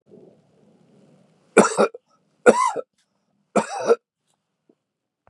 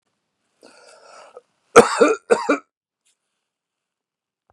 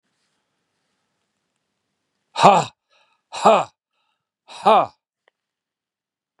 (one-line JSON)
{"three_cough_length": "5.3 s", "three_cough_amplitude": 32767, "three_cough_signal_mean_std_ratio": 0.28, "cough_length": "4.5 s", "cough_amplitude": 32768, "cough_signal_mean_std_ratio": 0.24, "exhalation_length": "6.4 s", "exhalation_amplitude": 32768, "exhalation_signal_mean_std_ratio": 0.24, "survey_phase": "beta (2021-08-13 to 2022-03-07)", "age": "45-64", "gender": "Male", "wearing_mask": "No", "symptom_none": true, "smoker_status": "Never smoked", "respiratory_condition_asthma": false, "respiratory_condition_other": false, "recruitment_source": "REACT", "submission_delay": "1 day", "covid_test_result": "Negative", "covid_test_method": "RT-qPCR", "covid_ct_value": 38.0, "covid_ct_gene": "N gene", "influenza_a_test_result": "Negative", "influenza_b_test_result": "Negative"}